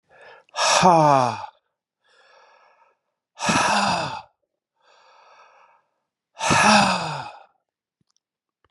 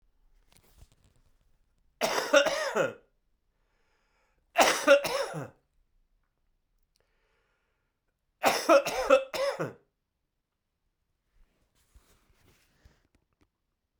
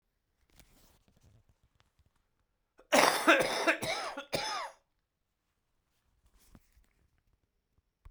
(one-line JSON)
{"exhalation_length": "8.7 s", "exhalation_amplitude": 27911, "exhalation_signal_mean_std_ratio": 0.4, "three_cough_length": "14.0 s", "three_cough_amplitude": 15067, "three_cough_signal_mean_std_ratio": 0.3, "cough_length": "8.1 s", "cough_amplitude": 13882, "cough_signal_mean_std_ratio": 0.29, "survey_phase": "beta (2021-08-13 to 2022-03-07)", "age": "65+", "gender": "Male", "wearing_mask": "No", "symptom_runny_or_blocked_nose": true, "symptom_sore_throat": true, "symptom_fatigue": true, "symptom_change_to_sense_of_smell_or_taste": true, "smoker_status": "Ex-smoker", "respiratory_condition_asthma": false, "respiratory_condition_other": false, "recruitment_source": "Test and Trace", "submission_delay": "2 days", "covid_test_result": "Positive", "covid_test_method": "RT-qPCR", "covid_ct_value": 24.4, "covid_ct_gene": "ORF1ab gene"}